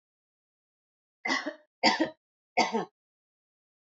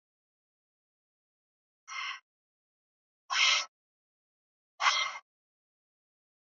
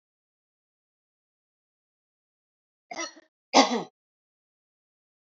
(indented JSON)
{
  "three_cough_length": "3.9 s",
  "three_cough_amplitude": 14041,
  "three_cough_signal_mean_std_ratio": 0.32,
  "exhalation_length": "6.6 s",
  "exhalation_amplitude": 9089,
  "exhalation_signal_mean_std_ratio": 0.27,
  "cough_length": "5.3 s",
  "cough_amplitude": 22573,
  "cough_signal_mean_std_ratio": 0.17,
  "survey_phase": "alpha (2021-03-01 to 2021-08-12)",
  "age": "18-44",
  "gender": "Female",
  "wearing_mask": "No",
  "symptom_fatigue": true,
  "symptom_headache": true,
  "symptom_onset": "2 days",
  "smoker_status": "Never smoked",
  "respiratory_condition_asthma": false,
  "respiratory_condition_other": false,
  "recruitment_source": "Test and Trace",
  "submission_delay": "1 day",
  "covid_test_result": "Positive",
  "covid_test_method": "RT-qPCR",
  "covid_ct_value": 20.3,
  "covid_ct_gene": "ORF1ab gene"
}